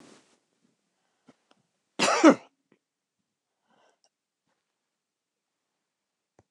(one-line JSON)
{"cough_length": "6.5 s", "cough_amplitude": 20243, "cough_signal_mean_std_ratio": 0.16, "survey_phase": "beta (2021-08-13 to 2022-03-07)", "age": "45-64", "gender": "Female", "wearing_mask": "No", "symptom_cough_any": true, "symptom_new_continuous_cough": true, "symptom_runny_or_blocked_nose": true, "symptom_sore_throat": true, "symptom_fatigue": true, "symptom_headache": true, "smoker_status": "Never smoked", "respiratory_condition_asthma": false, "respiratory_condition_other": false, "recruitment_source": "Test and Trace", "submission_delay": "0 days", "covid_test_result": "Positive", "covid_test_method": "LFT"}